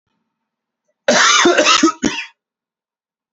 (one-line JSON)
{"cough_length": "3.3 s", "cough_amplitude": 31004, "cough_signal_mean_std_ratio": 0.46, "survey_phase": "beta (2021-08-13 to 2022-03-07)", "age": "45-64", "gender": "Male", "wearing_mask": "No", "symptom_cough_any": true, "symptom_runny_or_blocked_nose": true, "symptom_onset": "7 days", "smoker_status": "Never smoked", "respiratory_condition_asthma": true, "respiratory_condition_other": false, "recruitment_source": "Test and Trace", "submission_delay": "3 days", "covid_test_result": "Negative", "covid_test_method": "LAMP"}